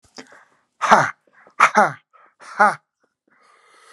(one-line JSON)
{"exhalation_length": "3.9 s", "exhalation_amplitude": 32768, "exhalation_signal_mean_std_ratio": 0.31, "survey_phase": "alpha (2021-03-01 to 2021-08-12)", "age": "45-64", "gender": "Male", "wearing_mask": "No", "symptom_none": true, "smoker_status": "Ex-smoker", "respiratory_condition_asthma": false, "respiratory_condition_other": false, "recruitment_source": "REACT", "submission_delay": "2 days", "covid_test_result": "Negative", "covid_test_method": "RT-qPCR"}